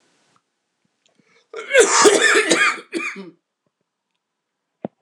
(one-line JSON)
{"cough_length": "5.0 s", "cough_amplitude": 26028, "cough_signal_mean_std_ratio": 0.39, "survey_phase": "beta (2021-08-13 to 2022-03-07)", "age": "45-64", "gender": "Male", "wearing_mask": "No", "symptom_new_continuous_cough": true, "symptom_runny_or_blocked_nose": true, "symptom_sore_throat": true, "symptom_abdominal_pain": true, "symptom_fatigue": true, "symptom_fever_high_temperature": true, "symptom_headache": true, "symptom_change_to_sense_of_smell_or_taste": true, "symptom_other": true, "symptom_onset": "6 days", "smoker_status": "Never smoked", "respiratory_condition_asthma": false, "respiratory_condition_other": false, "recruitment_source": "Test and Trace", "submission_delay": "1 day", "covid_test_result": "Positive", "covid_test_method": "RT-qPCR"}